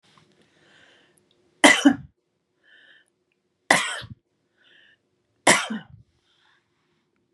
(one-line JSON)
{"three_cough_length": "7.3 s", "three_cough_amplitude": 32767, "three_cough_signal_mean_std_ratio": 0.23, "survey_phase": "beta (2021-08-13 to 2022-03-07)", "age": "45-64", "gender": "Female", "wearing_mask": "No", "symptom_none": true, "smoker_status": "Ex-smoker", "respiratory_condition_asthma": false, "respiratory_condition_other": false, "recruitment_source": "REACT", "submission_delay": "2 days", "covid_test_result": "Negative", "covid_test_method": "RT-qPCR", "influenza_a_test_result": "Negative", "influenza_b_test_result": "Negative"}